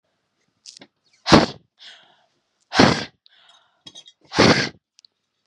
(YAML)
exhalation_length: 5.5 s
exhalation_amplitude: 32768
exhalation_signal_mean_std_ratio: 0.28
survey_phase: beta (2021-08-13 to 2022-03-07)
age: 18-44
gender: Female
wearing_mask: 'No'
symptom_none: true
symptom_onset: 13 days
smoker_status: Never smoked
respiratory_condition_asthma: false
respiratory_condition_other: false
recruitment_source: REACT
submission_delay: 2 days
covid_test_result: Negative
covid_test_method: RT-qPCR
influenza_a_test_result: Negative
influenza_b_test_result: Negative